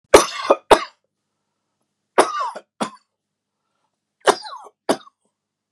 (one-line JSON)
{"three_cough_length": "5.7 s", "three_cough_amplitude": 32768, "three_cough_signal_mean_std_ratio": 0.25, "survey_phase": "beta (2021-08-13 to 2022-03-07)", "age": "45-64", "gender": "Male", "wearing_mask": "No", "symptom_fatigue": true, "symptom_onset": "12 days", "smoker_status": "Ex-smoker", "respiratory_condition_asthma": false, "respiratory_condition_other": false, "recruitment_source": "REACT", "submission_delay": "1 day", "covid_test_result": "Negative", "covid_test_method": "RT-qPCR", "influenza_a_test_result": "Negative", "influenza_b_test_result": "Negative"}